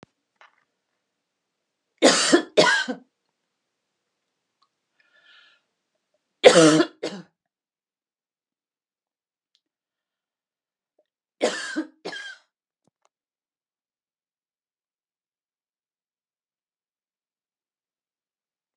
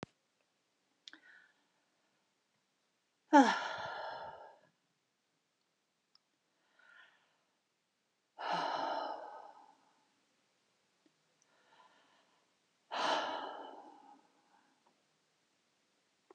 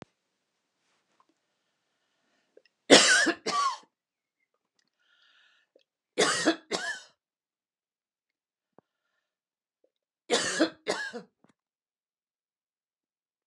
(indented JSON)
{
  "three_cough_length": "18.8 s",
  "three_cough_amplitude": 32767,
  "three_cough_signal_mean_std_ratio": 0.2,
  "exhalation_length": "16.3 s",
  "exhalation_amplitude": 8102,
  "exhalation_signal_mean_std_ratio": 0.24,
  "cough_length": "13.5 s",
  "cough_amplitude": 25366,
  "cough_signal_mean_std_ratio": 0.25,
  "survey_phase": "alpha (2021-03-01 to 2021-08-12)",
  "age": "65+",
  "gender": "Female",
  "wearing_mask": "No",
  "symptom_cough_any": true,
  "smoker_status": "Never smoked",
  "respiratory_condition_asthma": false,
  "respiratory_condition_other": false,
  "recruitment_source": "REACT",
  "submission_delay": "1 day",
  "covid_test_result": "Negative",
  "covid_test_method": "RT-qPCR"
}